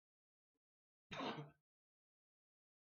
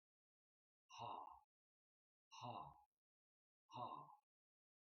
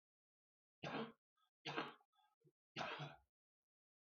{"cough_length": "2.9 s", "cough_amplitude": 674, "cough_signal_mean_std_ratio": 0.28, "exhalation_length": "4.9 s", "exhalation_amplitude": 419, "exhalation_signal_mean_std_ratio": 0.4, "three_cough_length": "4.0 s", "three_cough_amplitude": 1079, "three_cough_signal_mean_std_ratio": 0.38, "survey_phase": "beta (2021-08-13 to 2022-03-07)", "age": "45-64", "gender": "Male", "wearing_mask": "No", "symptom_cough_any": true, "symptom_runny_or_blocked_nose": true, "symptom_sore_throat": true, "smoker_status": "Never smoked", "respiratory_condition_asthma": false, "respiratory_condition_other": false, "recruitment_source": "REACT", "submission_delay": "3 days", "covid_test_result": "Negative", "covid_test_method": "RT-qPCR", "influenza_a_test_result": "Unknown/Void", "influenza_b_test_result": "Unknown/Void"}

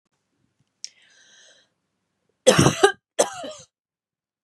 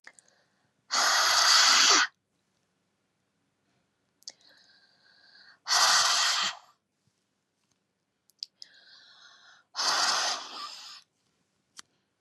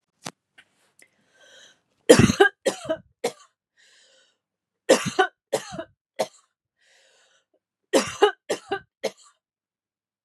{"cough_length": "4.4 s", "cough_amplitude": 30654, "cough_signal_mean_std_ratio": 0.25, "exhalation_length": "12.2 s", "exhalation_amplitude": 12909, "exhalation_signal_mean_std_ratio": 0.39, "three_cough_length": "10.2 s", "three_cough_amplitude": 32514, "three_cough_signal_mean_std_ratio": 0.26, "survey_phase": "beta (2021-08-13 to 2022-03-07)", "age": "45-64", "gender": "Female", "wearing_mask": "No", "symptom_none": true, "smoker_status": "Ex-smoker", "respiratory_condition_asthma": false, "respiratory_condition_other": false, "recruitment_source": "REACT", "submission_delay": "1 day", "covid_test_result": "Negative", "covid_test_method": "RT-qPCR", "influenza_a_test_result": "Negative", "influenza_b_test_result": "Negative"}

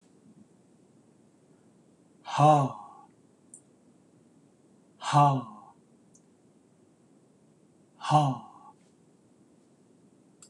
{"exhalation_length": "10.5 s", "exhalation_amplitude": 11041, "exhalation_signal_mean_std_ratio": 0.27, "survey_phase": "beta (2021-08-13 to 2022-03-07)", "age": "65+", "gender": "Male", "wearing_mask": "No", "symptom_none": true, "smoker_status": "Never smoked", "respiratory_condition_asthma": false, "respiratory_condition_other": false, "recruitment_source": "REACT", "submission_delay": "0 days", "covid_test_result": "Negative", "covid_test_method": "RT-qPCR"}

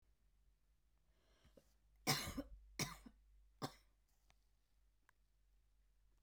{"three_cough_length": "6.2 s", "three_cough_amplitude": 1827, "three_cough_signal_mean_std_ratio": 0.28, "survey_phase": "beta (2021-08-13 to 2022-03-07)", "age": "45-64", "gender": "Female", "wearing_mask": "No", "symptom_cough_any": true, "symptom_runny_or_blocked_nose": true, "symptom_headache": true, "smoker_status": "Never smoked", "respiratory_condition_asthma": false, "respiratory_condition_other": false, "recruitment_source": "Test and Trace", "submission_delay": "2 days", "covid_test_result": "Positive", "covid_test_method": "ePCR"}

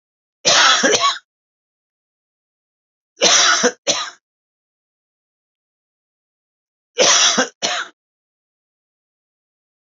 {"three_cough_length": "10.0 s", "three_cough_amplitude": 32767, "three_cough_signal_mean_std_ratio": 0.36, "survey_phase": "beta (2021-08-13 to 2022-03-07)", "age": "65+", "gender": "Male", "wearing_mask": "No", "symptom_none": true, "smoker_status": "Never smoked", "respiratory_condition_asthma": false, "respiratory_condition_other": false, "recruitment_source": "REACT", "submission_delay": "1 day", "covid_test_result": "Negative", "covid_test_method": "RT-qPCR", "influenza_a_test_result": "Unknown/Void", "influenza_b_test_result": "Unknown/Void"}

